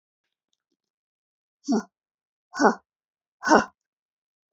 {"exhalation_length": "4.5 s", "exhalation_amplitude": 25819, "exhalation_signal_mean_std_ratio": 0.23, "survey_phase": "beta (2021-08-13 to 2022-03-07)", "age": "45-64", "gender": "Female", "wearing_mask": "No", "symptom_none": true, "smoker_status": "Never smoked", "respiratory_condition_asthma": false, "respiratory_condition_other": false, "recruitment_source": "REACT", "submission_delay": "2 days", "covid_test_result": "Negative", "covid_test_method": "RT-qPCR", "influenza_a_test_result": "Negative", "influenza_b_test_result": "Negative"}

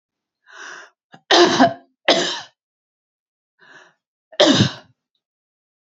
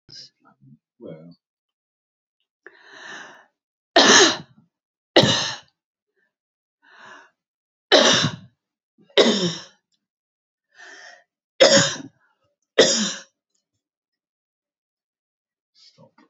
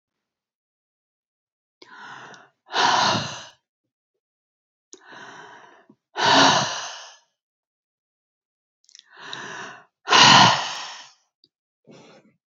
{"cough_length": "6.0 s", "cough_amplitude": 32768, "cough_signal_mean_std_ratio": 0.33, "three_cough_length": "16.3 s", "three_cough_amplitude": 29823, "three_cough_signal_mean_std_ratio": 0.29, "exhalation_length": "12.5 s", "exhalation_amplitude": 31962, "exhalation_signal_mean_std_ratio": 0.31, "survey_phase": "beta (2021-08-13 to 2022-03-07)", "age": "45-64", "gender": "Female", "wearing_mask": "No", "symptom_none": true, "smoker_status": "Never smoked", "respiratory_condition_asthma": true, "respiratory_condition_other": false, "recruitment_source": "REACT", "submission_delay": "0 days", "covid_test_result": "Negative", "covid_test_method": "RT-qPCR"}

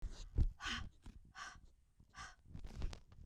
{"exhalation_length": "3.3 s", "exhalation_amplitude": 2271, "exhalation_signal_mean_std_ratio": 0.47, "survey_phase": "beta (2021-08-13 to 2022-03-07)", "age": "45-64", "gender": "Female", "wearing_mask": "No", "symptom_cough_any": true, "symptom_runny_or_blocked_nose": true, "symptom_headache": true, "smoker_status": "Never smoked", "respiratory_condition_asthma": false, "respiratory_condition_other": false, "recruitment_source": "Test and Trace", "submission_delay": "2 days", "covid_test_result": "Positive", "covid_test_method": "ePCR"}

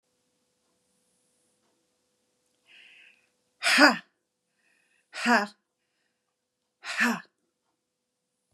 {"exhalation_length": "8.5 s", "exhalation_amplitude": 27349, "exhalation_signal_mean_std_ratio": 0.23, "survey_phase": "beta (2021-08-13 to 2022-03-07)", "age": "45-64", "gender": "Female", "wearing_mask": "Yes", "symptom_diarrhoea": true, "symptom_fatigue": true, "symptom_onset": "6 days", "smoker_status": "Ex-smoker", "respiratory_condition_asthma": false, "respiratory_condition_other": false, "recruitment_source": "REACT", "submission_delay": "1 day", "covid_test_result": "Negative", "covid_test_method": "RT-qPCR", "influenza_a_test_result": "Negative", "influenza_b_test_result": "Negative"}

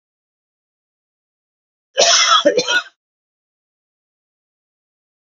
{"cough_length": "5.4 s", "cough_amplitude": 32577, "cough_signal_mean_std_ratio": 0.3, "survey_phase": "beta (2021-08-13 to 2022-03-07)", "age": "65+", "gender": "Male", "wearing_mask": "No", "symptom_none": true, "smoker_status": "Never smoked", "respiratory_condition_asthma": false, "respiratory_condition_other": false, "recruitment_source": "REACT", "submission_delay": "1 day", "covid_test_result": "Negative", "covid_test_method": "RT-qPCR", "influenza_a_test_result": "Unknown/Void", "influenza_b_test_result": "Unknown/Void"}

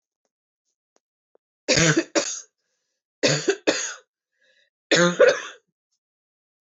{"three_cough_length": "6.7 s", "three_cough_amplitude": 19358, "three_cough_signal_mean_std_ratio": 0.35, "survey_phase": "beta (2021-08-13 to 2022-03-07)", "age": "18-44", "gender": "Female", "wearing_mask": "No", "symptom_cough_any": true, "symptom_runny_or_blocked_nose": true, "symptom_sore_throat": true, "symptom_fatigue": true, "symptom_headache": true, "symptom_change_to_sense_of_smell_or_taste": true, "smoker_status": "Never smoked", "respiratory_condition_asthma": false, "respiratory_condition_other": false, "recruitment_source": "Test and Trace", "submission_delay": "2 days", "covid_test_result": "Positive", "covid_test_method": "ePCR"}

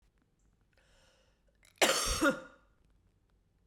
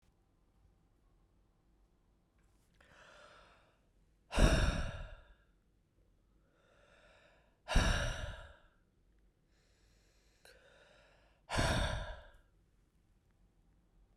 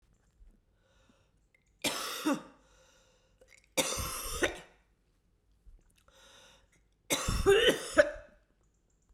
{"cough_length": "3.7 s", "cough_amplitude": 8433, "cough_signal_mean_std_ratio": 0.31, "exhalation_length": "14.2 s", "exhalation_amplitude": 5585, "exhalation_signal_mean_std_ratio": 0.3, "three_cough_length": "9.1 s", "three_cough_amplitude": 12306, "three_cough_signal_mean_std_ratio": 0.34, "survey_phase": "beta (2021-08-13 to 2022-03-07)", "age": "45-64", "gender": "Female", "wearing_mask": "No", "symptom_cough_any": true, "symptom_runny_or_blocked_nose": true, "symptom_sore_throat": true, "symptom_diarrhoea": true, "symptom_headache": true, "symptom_change_to_sense_of_smell_or_taste": true, "smoker_status": "Never smoked", "respiratory_condition_asthma": false, "respiratory_condition_other": false, "recruitment_source": "Test and Trace", "submission_delay": "2 days", "covid_test_result": "Positive", "covid_test_method": "RT-qPCR", "covid_ct_value": 23.1, "covid_ct_gene": "ORF1ab gene"}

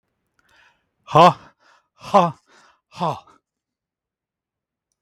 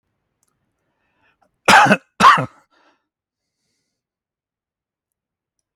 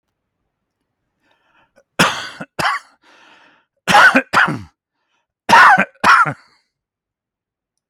{"exhalation_length": "5.0 s", "exhalation_amplitude": 32768, "exhalation_signal_mean_std_ratio": 0.23, "cough_length": "5.8 s", "cough_amplitude": 32767, "cough_signal_mean_std_ratio": 0.24, "three_cough_length": "7.9 s", "three_cough_amplitude": 32768, "three_cough_signal_mean_std_ratio": 0.35, "survey_phase": "beta (2021-08-13 to 2022-03-07)", "age": "65+", "gender": "Male", "wearing_mask": "No", "symptom_none": true, "smoker_status": "Never smoked", "respiratory_condition_asthma": false, "respiratory_condition_other": false, "recruitment_source": "REACT", "submission_delay": "2 days", "covid_test_result": "Negative", "covid_test_method": "RT-qPCR", "influenza_a_test_result": "Unknown/Void", "influenza_b_test_result": "Unknown/Void"}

